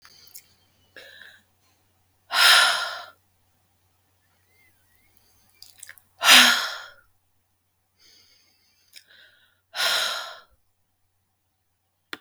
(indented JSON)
{
  "exhalation_length": "12.2 s",
  "exhalation_amplitude": 32766,
  "exhalation_signal_mean_std_ratio": 0.26,
  "survey_phase": "beta (2021-08-13 to 2022-03-07)",
  "age": "45-64",
  "gender": "Female",
  "wearing_mask": "No",
  "symptom_cough_any": true,
  "symptom_sore_throat": true,
  "symptom_fever_high_temperature": true,
  "symptom_onset": "12 days",
  "smoker_status": "Never smoked",
  "respiratory_condition_asthma": false,
  "respiratory_condition_other": false,
  "recruitment_source": "REACT",
  "submission_delay": "1 day",
  "covid_test_result": "Negative",
  "covid_test_method": "RT-qPCR"
}